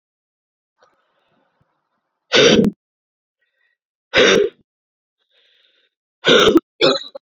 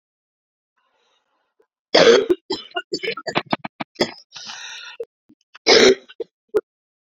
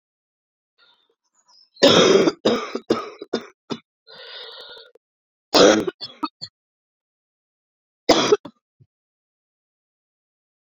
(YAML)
exhalation_length: 7.3 s
exhalation_amplitude: 30526
exhalation_signal_mean_std_ratio: 0.34
cough_length: 7.1 s
cough_amplitude: 31246
cough_signal_mean_std_ratio: 0.33
three_cough_length: 10.8 s
three_cough_amplitude: 30665
three_cough_signal_mean_std_ratio: 0.3
survey_phase: beta (2021-08-13 to 2022-03-07)
age: 45-64
gender: Female
wearing_mask: 'No'
symptom_new_continuous_cough: true
symptom_runny_or_blocked_nose: true
symptom_shortness_of_breath: true
symptom_sore_throat: true
symptom_abdominal_pain: true
symptom_fatigue: true
symptom_fever_high_temperature: true
symptom_headache: true
symptom_change_to_sense_of_smell_or_taste: true
symptom_loss_of_taste: true
symptom_onset: 4 days
smoker_status: Never smoked
respiratory_condition_asthma: true
respiratory_condition_other: false
recruitment_source: Test and Trace
submission_delay: 1 day
covid_test_result: Positive
covid_test_method: RT-qPCR
covid_ct_value: 16.3
covid_ct_gene: ORF1ab gene
covid_ct_mean: 16.8
covid_viral_load: 3100000 copies/ml
covid_viral_load_category: High viral load (>1M copies/ml)